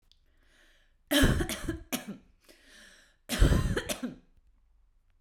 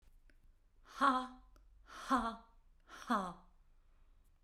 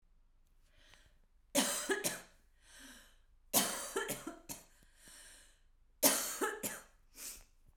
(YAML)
cough_length: 5.2 s
cough_amplitude: 10604
cough_signal_mean_std_ratio: 0.39
exhalation_length: 4.4 s
exhalation_amplitude: 3591
exhalation_signal_mean_std_ratio: 0.38
three_cough_length: 7.8 s
three_cough_amplitude: 7680
three_cough_signal_mean_std_ratio: 0.41
survey_phase: beta (2021-08-13 to 2022-03-07)
age: 45-64
gender: Female
wearing_mask: 'No'
symptom_cough_any: true
symptom_runny_or_blocked_nose: true
symptom_shortness_of_breath: true
symptom_sore_throat: true
symptom_abdominal_pain: true
symptom_fatigue: true
symptom_fever_high_temperature: true
symptom_headache: true
symptom_onset: 3 days
smoker_status: Current smoker (1 to 10 cigarettes per day)
respiratory_condition_asthma: false
respiratory_condition_other: true
recruitment_source: Test and Trace
submission_delay: 2 days
covid_test_result: Negative
covid_test_method: RT-qPCR